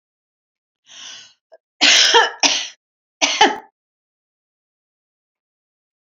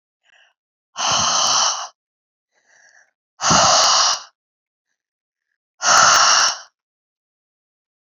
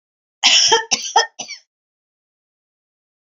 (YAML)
three_cough_length: 6.1 s
three_cough_amplitude: 32768
three_cough_signal_mean_std_ratio: 0.32
exhalation_length: 8.1 s
exhalation_amplitude: 29581
exhalation_signal_mean_std_ratio: 0.45
cough_length: 3.2 s
cough_amplitude: 32768
cough_signal_mean_std_ratio: 0.35
survey_phase: alpha (2021-03-01 to 2021-08-12)
age: 65+
gender: Female
wearing_mask: 'No'
symptom_new_continuous_cough: true
symptom_fatigue: true
smoker_status: Never smoked
respiratory_condition_asthma: false
respiratory_condition_other: false
recruitment_source: Test and Trace
submission_delay: 2 days
covid_test_result: Positive
covid_test_method: RT-qPCR
covid_ct_value: 31.4
covid_ct_gene: ORF1ab gene